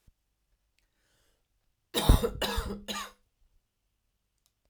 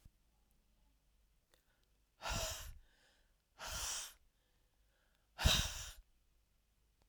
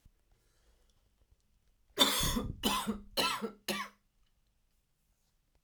{
  "three_cough_length": "4.7 s",
  "three_cough_amplitude": 15052,
  "three_cough_signal_mean_std_ratio": 0.27,
  "exhalation_length": "7.1 s",
  "exhalation_amplitude": 3812,
  "exhalation_signal_mean_std_ratio": 0.32,
  "cough_length": "5.6 s",
  "cough_amplitude": 9694,
  "cough_signal_mean_std_ratio": 0.39,
  "survey_phase": "alpha (2021-03-01 to 2021-08-12)",
  "age": "18-44",
  "gender": "Female",
  "wearing_mask": "No",
  "symptom_cough_any": true,
  "symptom_fatigue": true,
  "symptom_headache": true,
  "symptom_change_to_sense_of_smell_or_taste": true,
  "smoker_status": "Never smoked",
  "respiratory_condition_asthma": false,
  "respiratory_condition_other": false,
  "recruitment_source": "Test and Trace",
  "submission_delay": "1 day",
  "covid_test_result": "Positive",
  "covid_test_method": "RT-qPCR",
  "covid_ct_value": 22.3,
  "covid_ct_gene": "ORF1ab gene"
}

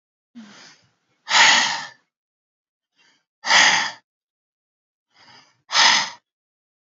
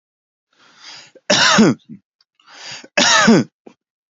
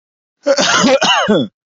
{
  "exhalation_length": "6.8 s",
  "exhalation_amplitude": 28507,
  "exhalation_signal_mean_std_ratio": 0.35,
  "three_cough_length": "4.1 s",
  "three_cough_amplitude": 32627,
  "three_cough_signal_mean_std_ratio": 0.42,
  "cough_length": "1.7 s",
  "cough_amplitude": 30032,
  "cough_signal_mean_std_ratio": 0.72,
  "survey_phase": "beta (2021-08-13 to 2022-03-07)",
  "age": "18-44",
  "gender": "Male",
  "wearing_mask": "No",
  "symptom_none": true,
  "smoker_status": "Ex-smoker",
  "respiratory_condition_asthma": false,
  "respiratory_condition_other": false,
  "recruitment_source": "REACT",
  "submission_delay": "1 day",
  "covid_test_result": "Negative",
  "covid_test_method": "RT-qPCR",
  "influenza_a_test_result": "Negative",
  "influenza_b_test_result": "Negative"
}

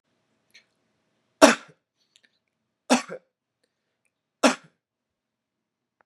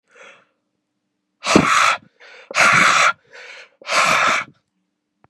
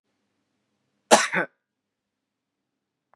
{
  "three_cough_length": "6.1 s",
  "three_cough_amplitude": 32767,
  "three_cough_signal_mean_std_ratio": 0.17,
  "exhalation_length": "5.3 s",
  "exhalation_amplitude": 32768,
  "exhalation_signal_mean_std_ratio": 0.48,
  "cough_length": "3.2 s",
  "cough_amplitude": 31794,
  "cough_signal_mean_std_ratio": 0.19,
  "survey_phase": "beta (2021-08-13 to 2022-03-07)",
  "age": "18-44",
  "gender": "Male",
  "wearing_mask": "No",
  "symptom_none": true,
  "smoker_status": "Never smoked",
  "respiratory_condition_asthma": false,
  "respiratory_condition_other": false,
  "recruitment_source": "REACT",
  "submission_delay": "3 days",
  "covid_test_result": "Negative",
  "covid_test_method": "RT-qPCR",
  "influenza_a_test_result": "Negative",
  "influenza_b_test_result": "Negative"
}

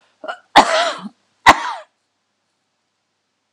{
  "cough_length": "3.5 s",
  "cough_amplitude": 32768,
  "cough_signal_mean_std_ratio": 0.29,
  "survey_phase": "alpha (2021-03-01 to 2021-08-12)",
  "age": "65+",
  "gender": "Female",
  "wearing_mask": "No",
  "symptom_change_to_sense_of_smell_or_taste": true,
  "smoker_status": "Ex-smoker",
  "respiratory_condition_asthma": false,
  "respiratory_condition_other": false,
  "recruitment_source": "REACT",
  "submission_delay": "1 day",
  "covid_test_result": "Negative",
  "covid_test_method": "RT-qPCR"
}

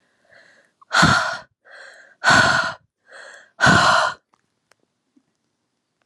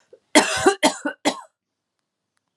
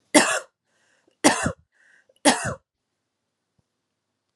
{
  "exhalation_length": "6.1 s",
  "exhalation_amplitude": 26906,
  "exhalation_signal_mean_std_ratio": 0.4,
  "cough_length": "2.6 s",
  "cough_amplitude": 30571,
  "cough_signal_mean_std_ratio": 0.35,
  "three_cough_length": "4.4 s",
  "three_cough_amplitude": 31980,
  "three_cough_signal_mean_std_ratio": 0.29,
  "survey_phase": "alpha (2021-03-01 to 2021-08-12)",
  "age": "45-64",
  "gender": "Female",
  "wearing_mask": "No",
  "symptom_cough_any": true,
  "symptom_shortness_of_breath": true,
  "symptom_fatigue": true,
  "symptom_headache": true,
  "symptom_change_to_sense_of_smell_or_taste": true,
  "symptom_onset": "12 days",
  "smoker_status": "Never smoked",
  "respiratory_condition_asthma": false,
  "respiratory_condition_other": false,
  "recruitment_source": "Test and Trace",
  "submission_delay": "2 days",
  "covid_test_result": "Positive",
  "covid_test_method": "RT-qPCR"
}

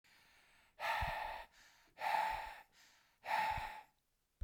{
  "exhalation_length": "4.4 s",
  "exhalation_amplitude": 1968,
  "exhalation_signal_mean_std_ratio": 0.54,
  "survey_phase": "beta (2021-08-13 to 2022-03-07)",
  "age": "45-64",
  "gender": "Male",
  "wearing_mask": "No",
  "symptom_none": true,
  "smoker_status": "Never smoked",
  "respiratory_condition_asthma": false,
  "respiratory_condition_other": false,
  "recruitment_source": "REACT",
  "submission_delay": "2 days",
  "covid_test_result": "Negative",
  "covid_test_method": "RT-qPCR"
}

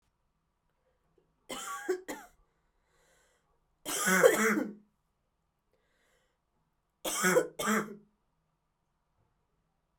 {
  "three_cough_length": "10.0 s",
  "three_cough_amplitude": 13505,
  "three_cough_signal_mean_std_ratio": 0.32,
  "survey_phase": "alpha (2021-03-01 to 2021-08-12)",
  "age": "18-44",
  "gender": "Female",
  "wearing_mask": "No",
  "symptom_cough_any": true,
  "symptom_diarrhoea": true,
  "symptom_fatigue": true,
  "symptom_fever_high_temperature": true,
  "symptom_headache": true,
  "symptom_change_to_sense_of_smell_or_taste": true,
  "symptom_loss_of_taste": true,
  "symptom_onset": "4 days",
  "smoker_status": "Never smoked",
  "respiratory_condition_asthma": false,
  "respiratory_condition_other": false,
  "recruitment_source": "Test and Trace",
  "submission_delay": "1 day",
  "covid_test_result": "Positive",
  "covid_test_method": "RT-qPCR",
  "covid_ct_value": 16.9,
  "covid_ct_gene": "ORF1ab gene",
  "covid_ct_mean": 17.5,
  "covid_viral_load": "1800000 copies/ml",
  "covid_viral_load_category": "High viral load (>1M copies/ml)"
}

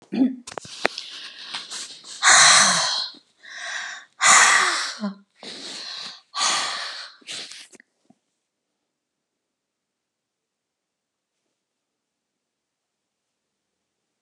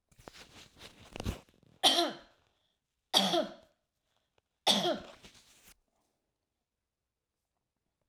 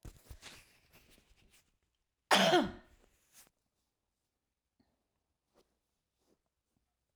{
  "exhalation_length": "14.2 s",
  "exhalation_amplitude": 32767,
  "exhalation_signal_mean_std_ratio": 0.35,
  "three_cough_length": "8.1 s",
  "three_cough_amplitude": 9865,
  "three_cough_signal_mean_std_ratio": 0.29,
  "cough_length": "7.2 s",
  "cough_amplitude": 9128,
  "cough_signal_mean_std_ratio": 0.2,
  "survey_phase": "alpha (2021-03-01 to 2021-08-12)",
  "age": "65+",
  "gender": "Female",
  "wearing_mask": "No",
  "symptom_none": true,
  "smoker_status": "Ex-smoker",
  "respiratory_condition_asthma": false,
  "respiratory_condition_other": false,
  "recruitment_source": "REACT",
  "submission_delay": "2 days",
  "covid_test_result": "Negative",
  "covid_test_method": "RT-qPCR"
}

